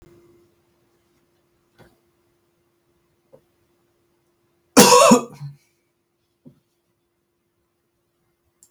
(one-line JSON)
{"cough_length": "8.7 s", "cough_amplitude": 32768, "cough_signal_mean_std_ratio": 0.19, "survey_phase": "alpha (2021-03-01 to 2021-08-12)", "age": "45-64", "gender": "Male", "wearing_mask": "No", "symptom_none": true, "smoker_status": "Never smoked", "respiratory_condition_asthma": false, "respiratory_condition_other": false, "recruitment_source": "REACT", "submission_delay": "3 days", "covid_test_result": "Negative", "covid_test_method": "RT-qPCR"}